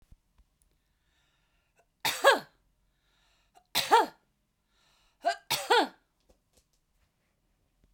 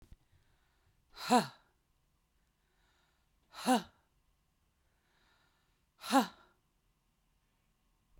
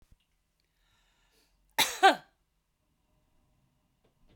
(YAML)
three_cough_length: 7.9 s
three_cough_amplitude: 14910
three_cough_signal_mean_std_ratio: 0.25
exhalation_length: 8.2 s
exhalation_amplitude: 6284
exhalation_signal_mean_std_ratio: 0.21
cough_length: 4.4 s
cough_amplitude: 12368
cough_signal_mean_std_ratio: 0.18
survey_phase: beta (2021-08-13 to 2022-03-07)
age: 45-64
gender: Female
wearing_mask: 'No'
symptom_none: true
smoker_status: Never smoked
respiratory_condition_asthma: false
respiratory_condition_other: false
recruitment_source: REACT
submission_delay: 1 day
covid_test_result: Negative
covid_test_method: RT-qPCR